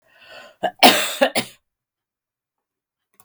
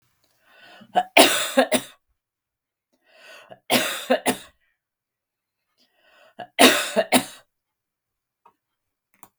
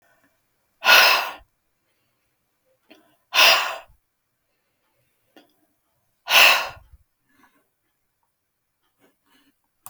cough_length: 3.2 s
cough_amplitude: 32768
cough_signal_mean_std_ratio: 0.28
three_cough_length: 9.4 s
three_cough_amplitude: 32768
three_cough_signal_mean_std_ratio: 0.3
exhalation_length: 9.9 s
exhalation_amplitude: 32122
exhalation_signal_mean_std_ratio: 0.26
survey_phase: beta (2021-08-13 to 2022-03-07)
age: 45-64
gender: Female
wearing_mask: 'No'
symptom_none: true
smoker_status: Never smoked
respiratory_condition_asthma: false
respiratory_condition_other: false
recruitment_source: REACT
submission_delay: 1 day
covid_test_result: Negative
covid_test_method: RT-qPCR
influenza_a_test_result: Negative
influenza_b_test_result: Negative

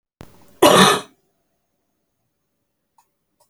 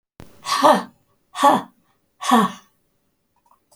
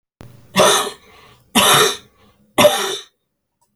cough_length: 3.5 s
cough_amplitude: 31557
cough_signal_mean_std_ratio: 0.26
exhalation_length: 3.8 s
exhalation_amplitude: 28934
exhalation_signal_mean_std_ratio: 0.36
three_cough_length: 3.8 s
three_cough_amplitude: 32767
three_cough_signal_mean_std_ratio: 0.44
survey_phase: alpha (2021-03-01 to 2021-08-12)
age: 65+
gender: Female
wearing_mask: 'No'
symptom_cough_any: true
symptom_shortness_of_breath: true
symptom_fatigue: true
symptom_onset: 12 days
smoker_status: Ex-smoker
respiratory_condition_asthma: false
respiratory_condition_other: true
recruitment_source: REACT
submission_delay: 2 days
covid_test_result: Negative
covid_test_method: RT-qPCR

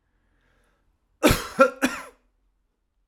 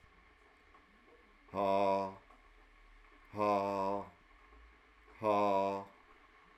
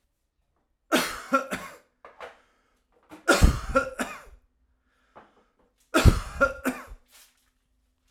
cough_length: 3.1 s
cough_amplitude: 24053
cough_signal_mean_std_ratio: 0.27
exhalation_length: 6.6 s
exhalation_amplitude: 3677
exhalation_signal_mean_std_ratio: 0.47
three_cough_length: 8.1 s
three_cough_amplitude: 21835
three_cough_signal_mean_std_ratio: 0.32
survey_phase: alpha (2021-03-01 to 2021-08-12)
age: 45-64
gender: Male
wearing_mask: 'No'
symptom_none: true
smoker_status: Ex-smoker
respiratory_condition_asthma: false
respiratory_condition_other: false
recruitment_source: REACT
submission_delay: 4 days
covid_test_result: Negative
covid_test_method: RT-qPCR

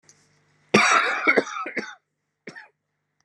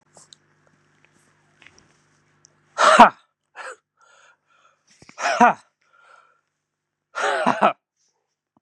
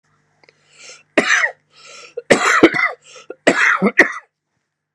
cough_length: 3.2 s
cough_amplitude: 23862
cough_signal_mean_std_ratio: 0.4
exhalation_length: 8.6 s
exhalation_amplitude: 32768
exhalation_signal_mean_std_ratio: 0.24
three_cough_length: 4.9 s
three_cough_amplitude: 32768
three_cough_signal_mean_std_ratio: 0.42
survey_phase: beta (2021-08-13 to 2022-03-07)
age: 45-64
gender: Female
wearing_mask: 'No'
symptom_cough_any: true
symptom_sore_throat: true
symptom_fatigue: true
symptom_headache: true
symptom_other: true
smoker_status: Never smoked
respiratory_condition_asthma: false
respiratory_condition_other: false
recruitment_source: Test and Trace
submission_delay: 4 days
covid_test_result: Negative
covid_test_method: ePCR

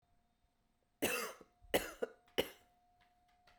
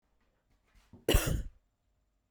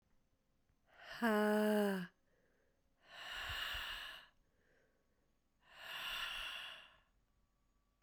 three_cough_length: 3.6 s
three_cough_amplitude: 4385
three_cough_signal_mean_std_ratio: 0.31
cough_length: 2.3 s
cough_amplitude: 7181
cough_signal_mean_std_ratio: 0.29
exhalation_length: 8.0 s
exhalation_amplitude: 1892
exhalation_signal_mean_std_ratio: 0.43
survey_phase: beta (2021-08-13 to 2022-03-07)
age: 18-44
gender: Female
wearing_mask: 'No'
symptom_cough_any: true
symptom_runny_or_blocked_nose: true
symptom_fatigue: true
symptom_fever_high_temperature: true
symptom_change_to_sense_of_smell_or_taste: true
symptom_onset: 3 days
smoker_status: Ex-smoker
respiratory_condition_asthma: false
respiratory_condition_other: false
recruitment_source: Test and Trace
submission_delay: 2 days
covid_test_result: Positive
covid_test_method: RT-qPCR
covid_ct_value: 25.6
covid_ct_gene: ORF1ab gene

